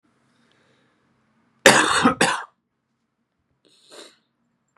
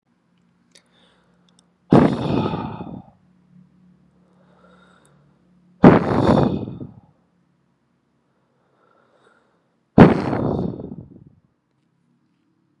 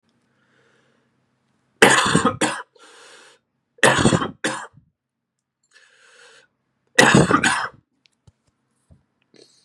{"cough_length": "4.8 s", "cough_amplitude": 32768, "cough_signal_mean_std_ratio": 0.28, "exhalation_length": "12.8 s", "exhalation_amplitude": 32768, "exhalation_signal_mean_std_ratio": 0.28, "three_cough_length": "9.6 s", "three_cough_amplitude": 32768, "three_cough_signal_mean_std_ratio": 0.33, "survey_phase": "beta (2021-08-13 to 2022-03-07)", "age": "18-44", "gender": "Male", "wearing_mask": "No", "symptom_cough_any": true, "symptom_new_continuous_cough": true, "symptom_runny_or_blocked_nose": true, "symptom_sore_throat": true, "symptom_diarrhoea": true, "symptom_fatigue": true, "symptom_onset": "3 days", "smoker_status": "Never smoked", "respiratory_condition_asthma": false, "respiratory_condition_other": false, "recruitment_source": "Test and Trace", "submission_delay": "2 days", "covid_test_result": "Positive", "covid_test_method": "RT-qPCR", "covid_ct_value": 16.7, "covid_ct_gene": "N gene"}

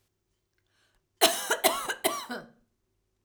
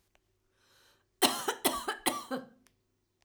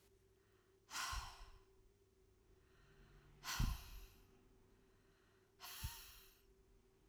{"cough_length": "3.2 s", "cough_amplitude": 17600, "cough_signal_mean_std_ratio": 0.36, "three_cough_length": "3.2 s", "three_cough_amplitude": 10152, "three_cough_signal_mean_std_ratio": 0.36, "exhalation_length": "7.1 s", "exhalation_amplitude": 1465, "exhalation_signal_mean_std_ratio": 0.4, "survey_phase": "alpha (2021-03-01 to 2021-08-12)", "age": "45-64", "gender": "Female", "wearing_mask": "No", "symptom_cough_any": true, "symptom_fatigue": true, "symptom_onset": "2 days", "smoker_status": "Ex-smoker", "respiratory_condition_asthma": false, "respiratory_condition_other": false, "recruitment_source": "REACT", "submission_delay": "1 day", "covid_test_result": "Negative", "covid_test_method": "RT-qPCR"}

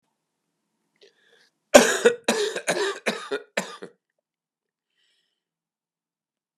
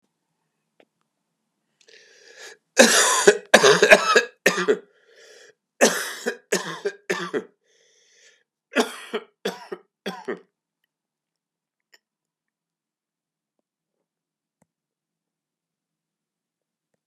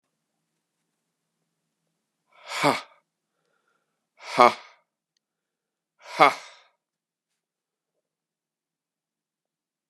{"cough_length": "6.6 s", "cough_amplitude": 32768, "cough_signal_mean_std_ratio": 0.27, "three_cough_length": "17.1 s", "three_cough_amplitude": 32768, "three_cough_signal_mean_std_ratio": 0.27, "exhalation_length": "9.9 s", "exhalation_amplitude": 32071, "exhalation_signal_mean_std_ratio": 0.16, "survey_phase": "beta (2021-08-13 to 2022-03-07)", "age": "65+", "gender": "Male", "wearing_mask": "No", "symptom_cough_any": true, "symptom_sore_throat": true, "symptom_headache": true, "symptom_onset": "4 days", "smoker_status": "Ex-smoker", "respiratory_condition_asthma": false, "respiratory_condition_other": false, "recruitment_source": "Test and Trace", "submission_delay": "2 days", "covid_test_result": "Positive", "covid_test_method": "RT-qPCR", "covid_ct_value": 14.2, "covid_ct_gene": "N gene"}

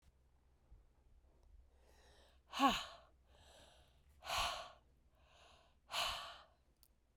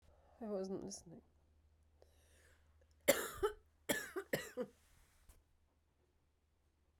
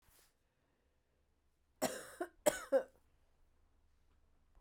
{"exhalation_length": "7.2 s", "exhalation_amplitude": 3119, "exhalation_signal_mean_std_ratio": 0.32, "three_cough_length": "7.0 s", "three_cough_amplitude": 5029, "three_cough_signal_mean_std_ratio": 0.33, "cough_length": "4.6 s", "cough_amplitude": 4719, "cough_signal_mean_std_ratio": 0.24, "survey_phase": "beta (2021-08-13 to 2022-03-07)", "age": "45-64", "gender": "Female", "wearing_mask": "No", "symptom_cough_any": true, "symptom_runny_or_blocked_nose": true, "symptom_shortness_of_breath": true, "symptom_sore_throat": true, "symptom_fatigue": true, "symptom_headache": true, "symptom_onset": "2 days", "smoker_status": "Never smoked", "respiratory_condition_asthma": false, "respiratory_condition_other": false, "recruitment_source": "Test and Trace", "submission_delay": "2 days", "covid_test_method": "PCR", "covid_ct_value": 36.0, "covid_ct_gene": "ORF1ab gene"}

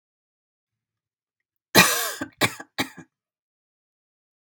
{"cough_length": "4.6 s", "cough_amplitude": 32768, "cough_signal_mean_std_ratio": 0.24, "survey_phase": "beta (2021-08-13 to 2022-03-07)", "age": "45-64", "gender": "Female", "wearing_mask": "No", "symptom_fatigue": true, "symptom_onset": "5 days", "smoker_status": "Ex-smoker", "respiratory_condition_asthma": false, "respiratory_condition_other": false, "recruitment_source": "REACT", "submission_delay": "1 day", "covid_test_result": "Negative", "covid_test_method": "RT-qPCR", "influenza_a_test_result": "Negative", "influenza_b_test_result": "Negative"}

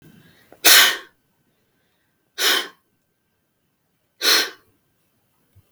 {"exhalation_length": "5.7 s", "exhalation_amplitude": 32768, "exhalation_signal_mean_std_ratio": 0.28, "survey_phase": "beta (2021-08-13 to 2022-03-07)", "age": "45-64", "gender": "Female", "wearing_mask": "No", "symptom_none": true, "smoker_status": "Never smoked", "respiratory_condition_asthma": false, "respiratory_condition_other": false, "recruitment_source": "REACT", "submission_delay": "5 days", "covid_test_result": "Negative", "covid_test_method": "RT-qPCR", "influenza_a_test_result": "Unknown/Void", "influenza_b_test_result": "Unknown/Void"}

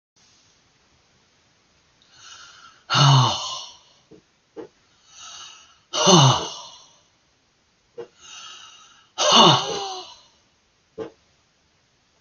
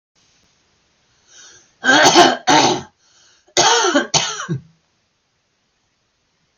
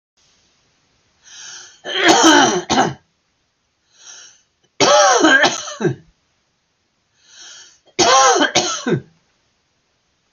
{"exhalation_length": "12.2 s", "exhalation_amplitude": 28320, "exhalation_signal_mean_std_ratio": 0.32, "cough_length": "6.6 s", "cough_amplitude": 32616, "cough_signal_mean_std_ratio": 0.4, "three_cough_length": "10.3 s", "three_cough_amplitude": 32768, "three_cough_signal_mean_std_ratio": 0.43, "survey_phase": "alpha (2021-03-01 to 2021-08-12)", "age": "45-64", "gender": "Male", "wearing_mask": "No", "symptom_cough_any": true, "smoker_status": "Never smoked", "respiratory_condition_asthma": true, "respiratory_condition_other": false, "recruitment_source": "REACT", "submission_delay": "2 days", "covid_test_result": "Negative", "covid_test_method": "RT-qPCR"}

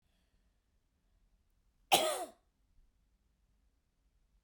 {"cough_length": "4.4 s", "cough_amplitude": 8107, "cough_signal_mean_std_ratio": 0.2, "survey_phase": "beta (2021-08-13 to 2022-03-07)", "age": "45-64", "gender": "Female", "wearing_mask": "No", "symptom_cough_any": true, "symptom_runny_or_blocked_nose": true, "symptom_onset": "5 days", "smoker_status": "Never smoked", "respiratory_condition_asthma": false, "respiratory_condition_other": false, "recruitment_source": "REACT", "submission_delay": "1 day", "covid_test_result": "Negative", "covid_test_method": "RT-qPCR"}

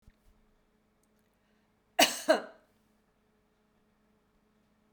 {"cough_length": "4.9 s", "cough_amplitude": 15778, "cough_signal_mean_std_ratio": 0.19, "survey_phase": "beta (2021-08-13 to 2022-03-07)", "age": "45-64", "gender": "Female", "wearing_mask": "No", "symptom_headache": true, "smoker_status": "Never smoked", "respiratory_condition_asthma": false, "respiratory_condition_other": false, "recruitment_source": "REACT", "submission_delay": "2 days", "covid_test_result": "Negative", "covid_test_method": "RT-qPCR"}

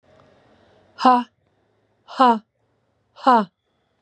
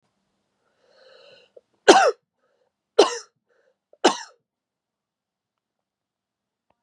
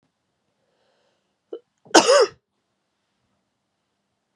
{"exhalation_length": "4.0 s", "exhalation_amplitude": 26519, "exhalation_signal_mean_std_ratio": 0.3, "three_cough_length": "6.8 s", "three_cough_amplitude": 32768, "three_cough_signal_mean_std_ratio": 0.19, "cough_length": "4.4 s", "cough_amplitude": 32768, "cough_signal_mean_std_ratio": 0.21, "survey_phase": "beta (2021-08-13 to 2022-03-07)", "age": "45-64", "gender": "Female", "wearing_mask": "No", "symptom_cough_any": true, "symptom_runny_or_blocked_nose": true, "symptom_shortness_of_breath": true, "symptom_sore_throat": true, "symptom_fatigue": true, "symptom_headache": true, "symptom_onset": "3 days", "smoker_status": "Ex-smoker", "respiratory_condition_asthma": false, "respiratory_condition_other": false, "recruitment_source": "Test and Trace", "submission_delay": "2 days", "covid_test_result": "Positive", "covid_test_method": "RT-qPCR", "covid_ct_value": 20.9, "covid_ct_gene": "N gene", "covid_ct_mean": 21.3, "covid_viral_load": "100000 copies/ml", "covid_viral_load_category": "Low viral load (10K-1M copies/ml)"}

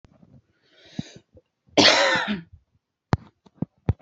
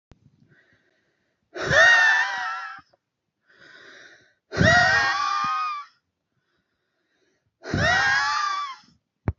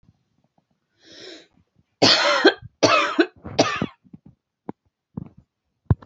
{"cough_length": "4.0 s", "cough_amplitude": 28312, "cough_signal_mean_std_ratio": 0.32, "exhalation_length": "9.4 s", "exhalation_amplitude": 19206, "exhalation_signal_mean_std_ratio": 0.49, "three_cough_length": "6.1 s", "three_cough_amplitude": 27701, "three_cough_signal_mean_std_ratio": 0.35, "survey_phase": "beta (2021-08-13 to 2022-03-07)", "age": "18-44", "gender": "Female", "wearing_mask": "No", "symptom_cough_any": true, "symptom_new_continuous_cough": true, "symptom_fatigue": true, "smoker_status": "Current smoker (11 or more cigarettes per day)", "respiratory_condition_asthma": true, "respiratory_condition_other": false, "recruitment_source": "REACT", "submission_delay": "1 day", "covid_test_result": "Negative", "covid_test_method": "RT-qPCR", "influenza_a_test_result": "Negative", "influenza_b_test_result": "Negative"}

